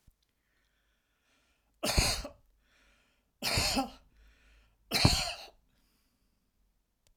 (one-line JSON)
{"three_cough_length": "7.2 s", "three_cough_amplitude": 11092, "three_cough_signal_mean_std_ratio": 0.33, "survey_phase": "alpha (2021-03-01 to 2021-08-12)", "age": "65+", "gender": "Male", "wearing_mask": "No", "symptom_none": true, "smoker_status": "Never smoked", "respiratory_condition_asthma": false, "respiratory_condition_other": false, "recruitment_source": "REACT", "submission_delay": "1 day", "covid_test_result": "Negative", "covid_test_method": "RT-qPCR"}